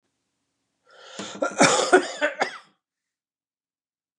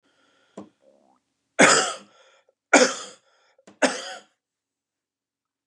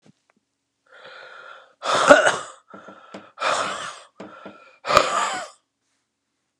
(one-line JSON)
{"cough_length": "4.2 s", "cough_amplitude": 25280, "cough_signal_mean_std_ratio": 0.33, "three_cough_length": "5.7 s", "three_cough_amplitude": 28573, "three_cough_signal_mean_std_ratio": 0.26, "exhalation_length": "6.6 s", "exhalation_amplitude": 32768, "exhalation_signal_mean_std_ratio": 0.35, "survey_phase": "alpha (2021-03-01 to 2021-08-12)", "age": "65+", "gender": "Male", "wearing_mask": "No", "symptom_none": true, "smoker_status": "Ex-smoker", "respiratory_condition_asthma": false, "respiratory_condition_other": false, "recruitment_source": "REACT", "submission_delay": "2 days", "covid_test_result": "Negative", "covid_test_method": "RT-qPCR"}